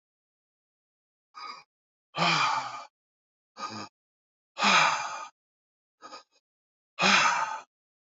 {"exhalation_length": "8.2 s", "exhalation_amplitude": 14976, "exhalation_signal_mean_std_ratio": 0.38, "survey_phase": "beta (2021-08-13 to 2022-03-07)", "age": "45-64", "gender": "Male", "wearing_mask": "No", "symptom_none": true, "smoker_status": "Ex-smoker", "respiratory_condition_asthma": false, "respiratory_condition_other": false, "recruitment_source": "REACT", "submission_delay": "2 days", "covid_test_result": "Negative", "covid_test_method": "RT-qPCR"}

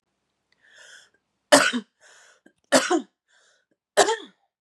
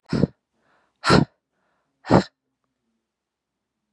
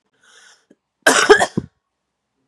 {"three_cough_length": "4.6 s", "three_cough_amplitude": 31196, "three_cough_signal_mean_std_ratio": 0.29, "exhalation_length": "3.9 s", "exhalation_amplitude": 28308, "exhalation_signal_mean_std_ratio": 0.25, "cough_length": "2.5 s", "cough_amplitude": 32768, "cough_signal_mean_std_ratio": 0.3, "survey_phase": "beta (2021-08-13 to 2022-03-07)", "age": "18-44", "gender": "Female", "wearing_mask": "No", "symptom_cough_any": true, "symptom_runny_or_blocked_nose": true, "symptom_shortness_of_breath": true, "symptom_sore_throat": true, "symptom_fatigue": true, "symptom_fever_high_temperature": true, "symptom_onset": "2 days", "smoker_status": "Ex-smoker", "respiratory_condition_asthma": false, "respiratory_condition_other": false, "recruitment_source": "Test and Trace", "submission_delay": "1 day", "covid_test_result": "Positive", "covid_test_method": "RT-qPCR", "covid_ct_value": 17.6, "covid_ct_gene": "ORF1ab gene", "covid_ct_mean": 17.8, "covid_viral_load": "1400000 copies/ml", "covid_viral_load_category": "High viral load (>1M copies/ml)"}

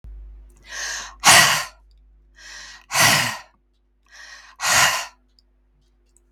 {"exhalation_length": "6.3 s", "exhalation_amplitude": 32768, "exhalation_signal_mean_std_ratio": 0.39, "survey_phase": "beta (2021-08-13 to 2022-03-07)", "age": "65+", "gender": "Female", "wearing_mask": "No", "symptom_none": true, "smoker_status": "Ex-smoker", "respiratory_condition_asthma": false, "respiratory_condition_other": false, "recruitment_source": "REACT", "submission_delay": "2 days", "covid_test_result": "Negative", "covid_test_method": "RT-qPCR", "influenza_a_test_result": "Positive", "influenza_a_ct_value": 31.8, "influenza_b_test_result": "Positive", "influenza_b_ct_value": 32.6}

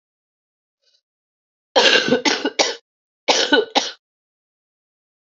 {"cough_length": "5.4 s", "cough_amplitude": 32767, "cough_signal_mean_std_ratio": 0.37, "survey_phase": "alpha (2021-03-01 to 2021-08-12)", "age": "45-64", "gender": "Female", "wearing_mask": "No", "symptom_cough_any": true, "symptom_new_continuous_cough": true, "symptom_shortness_of_breath": true, "symptom_fatigue": true, "symptom_fever_high_temperature": true, "symptom_headache": true, "symptom_change_to_sense_of_smell_or_taste": true, "symptom_onset": "3 days", "smoker_status": "Ex-smoker", "respiratory_condition_asthma": false, "respiratory_condition_other": false, "recruitment_source": "Test and Trace", "submission_delay": "1 day", "covid_test_result": "Positive", "covid_test_method": "RT-qPCR"}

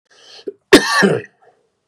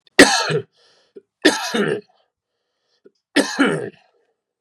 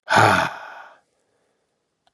{"cough_length": "1.9 s", "cough_amplitude": 32768, "cough_signal_mean_std_ratio": 0.37, "three_cough_length": "4.6 s", "three_cough_amplitude": 32768, "three_cough_signal_mean_std_ratio": 0.37, "exhalation_length": "2.1 s", "exhalation_amplitude": 26920, "exhalation_signal_mean_std_ratio": 0.37, "survey_phase": "beta (2021-08-13 to 2022-03-07)", "age": "45-64", "gender": "Male", "wearing_mask": "No", "symptom_runny_or_blocked_nose": true, "symptom_headache": true, "symptom_change_to_sense_of_smell_or_taste": true, "smoker_status": "Never smoked", "respiratory_condition_asthma": false, "respiratory_condition_other": false, "recruitment_source": "Test and Trace", "submission_delay": "2 days", "covid_test_result": "Positive", "covid_test_method": "RT-qPCR", "covid_ct_value": 20.9, "covid_ct_gene": "ORF1ab gene", "covid_ct_mean": 21.3, "covid_viral_load": "110000 copies/ml", "covid_viral_load_category": "Low viral load (10K-1M copies/ml)"}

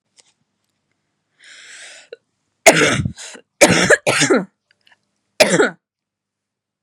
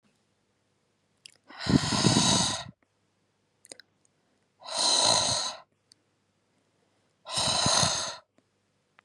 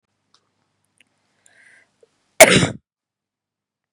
{"three_cough_length": "6.8 s", "three_cough_amplitude": 32768, "three_cough_signal_mean_std_ratio": 0.35, "exhalation_length": "9.0 s", "exhalation_amplitude": 14169, "exhalation_signal_mean_std_ratio": 0.43, "cough_length": "3.9 s", "cough_amplitude": 32768, "cough_signal_mean_std_ratio": 0.19, "survey_phase": "beta (2021-08-13 to 2022-03-07)", "age": "18-44", "gender": "Female", "wearing_mask": "No", "symptom_headache": true, "symptom_onset": "12 days", "smoker_status": "Ex-smoker", "respiratory_condition_asthma": false, "respiratory_condition_other": false, "recruitment_source": "REACT", "submission_delay": "1 day", "covid_test_result": "Negative", "covid_test_method": "RT-qPCR", "influenza_a_test_result": "Negative", "influenza_b_test_result": "Negative"}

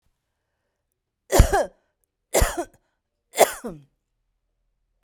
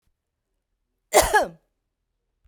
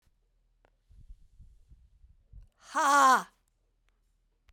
{"three_cough_length": "5.0 s", "three_cough_amplitude": 32768, "three_cough_signal_mean_std_ratio": 0.26, "cough_length": "2.5 s", "cough_amplitude": 28827, "cough_signal_mean_std_ratio": 0.26, "exhalation_length": "4.5 s", "exhalation_amplitude": 9569, "exhalation_signal_mean_std_ratio": 0.28, "survey_phase": "beta (2021-08-13 to 2022-03-07)", "age": "65+", "gender": "Female", "wearing_mask": "Yes", "symptom_none": true, "smoker_status": "Ex-smoker", "respiratory_condition_asthma": false, "respiratory_condition_other": false, "recruitment_source": "REACT", "submission_delay": "2 days", "covid_test_result": "Negative", "covid_test_method": "RT-qPCR"}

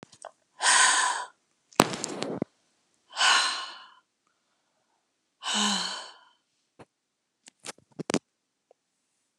{"exhalation_length": "9.4 s", "exhalation_amplitude": 32768, "exhalation_signal_mean_std_ratio": 0.35, "survey_phase": "alpha (2021-03-01 to 2021-08-12)", "age": "65+", "gender": "Female", "wearing_mask": "No", "symptom_none": true, "smoker_status": "Never smoked", "respiratory_condition_asthma": true, "respiratory_condition_other": false, "recruitment_source": "REACT", "submission_delay": "2 days", "covid_test_result": "Negative", "covid_test_method": "RT-qPCR"}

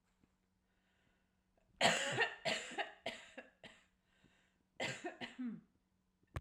{"cough_length": "6.4 s", "cough_amplitude": 5101, "cough_signal_mean_std_ratio": 0.38, "survey_phase": "alpha (2021-03-01 to 2021-08-12)", "age": "45-64", "gender": "Female", "wearing_mask": "No", "symptom_none": true, "smoker_status": "Ex-smoker", "respiratory_condition_asthma": false, "respiratory_condition_other": false, "recruitment_source": "REACT", "submission_delay": "3 days", "covid_test_result": "Negative", "covid_test_method": "RT-qPCR"}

